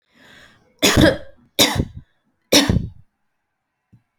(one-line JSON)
{"three_cough_length": "4.2 s", "three_cough_amplitude": 32768, "three_cough_signal_mean_std_ratio": 0.36, "survey_phase": "beta (2021-08-13 to 2022-03-07)", "age": "18-44", "gender": "Female", "wearing_mask": "No", "symptom_none": true, "smoker_status": "Never smoked", "respiratory_condition_asthma": false, "respiratory_condition_other": false, "recruitment_source": "REACT", "submission_delay": "1 day", "covid_test_result": "Negative", "covid_test_method": "RT-qPCR"}